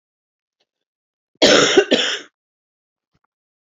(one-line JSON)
{"cough_length": "3.7 s", "cough_amplitude": 32767, "cough_signal_mean_std_ratio": 0.33, "survey_phase": "beta (2021-08-13 to 2022-03-07)", "age": "45-64", "gender": "Female", "wearing_mask": "No", "symptom_cough_any": true, "smoker_status": "Never smoked", "respiratory_condition_asthma": true, "respiratory_condition_other": false, "recruitment_source": "REACT", "submission_delay": "2 days", "covid_test_result": "Negative", "covid_test_method": "RT-qPCR", "influenza_a_test_result": "Negative", "influenza_b_test_result": "Negative"}